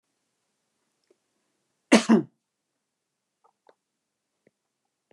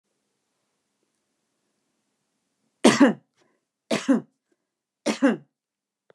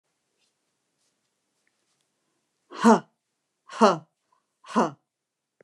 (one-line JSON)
{"cough_length": "5.1 s", "cough_amplitude": 22365, "cough_signal_mean_std_ratio": 0.16, "three_cough_length": "6.1 s", "three_cough_amplitude": 25523, "three_cough_signal_mean_std_ratio": 0.25, "exhalation_length": "5.6 s", "exhalation_amplitude": 22581, "exhalation_signal_mean_std_ratio": 0.22, "survey_phase": "beta (2021-08-13 to 2022-03-07)", "age": "65+", "gender": "Female", "wearing_mask": "No", "symptom_none": true, "smoker_status": "Never smoked", "respiratory_condition_asthma": false, "respiratory_condition_other": false, "recruitment_source": "REACT", "submission_delay": "2 days", "covid_test_result": "Negative", "covid_test_method": "RT-qPCR", "influenza_a_test_result": "Negative", "influenza_b_test_result": "Negative"}